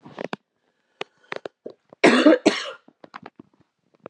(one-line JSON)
{"cough_length": "4.1 s", "cough_amplitude": 30891, "cough_signal_mean_std_ratio": 0.28, "survey_phase": "beta (2021-08-13 to 2022-03-07)", "age": "18-44", "gender": "Female", "wearing_mask": "No", "symptom_cough_any": true, "symptom_runny_or_blocked_nose": true, "symptom_fatigue": true, "symptom_headache": true, "symptom_change_to_sense_of_smell_or_taste": true, "symptom_loss_of_taste": true, "smoker_status": "Never smoked", "respiratory_condition_asthma": false, "respiratory_condition_other": false, "recruitment_source": "Test and Trace", "submission_delay": "3 days", "covid_test_result": "Positive", "covid_test_method": "LFT"}